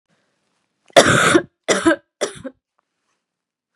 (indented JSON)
{
  "three_cough_length": "3.8 s",
  "three_cough_amplitude": 32768,
  "three_cough_signal_mean_std_ratio": 0.35,
  "survey_phase": "beta (2021-08-13 to 2022-03-07)",
  "age": "18-44",
  "gender": "Female",
  "wearing_mask": "No",
  "symptom_cough_any": true,
  "symptom_runny_or_blocked_nose": true,
  "symptom_shortness_of_breath": true,
  "symptom_sore_throat": true,
  "symptom_fatigue": true,
  "symptom_onset": "4 days",
  "smoker_status": "Never smoked",
  "respiratory_condition_asthma": false,
  "respiratory_condition_other": false,
  "recruitment_source": "Test and Trace",
  "submission_delay": "2 days",
  "covid_test_result": "Positive",
  "covid_test_method": "RT-qPCR",
  "covid_ct_value": 17.1,
  "covid_ct_gene": "ORF1ab gene",
  "covid_ct_mean": 17.4,
  "covid_viral_load": "1900000 copies/ml",
  "covid_viral_load_category": "High viral load (>1M copies/ml)"
}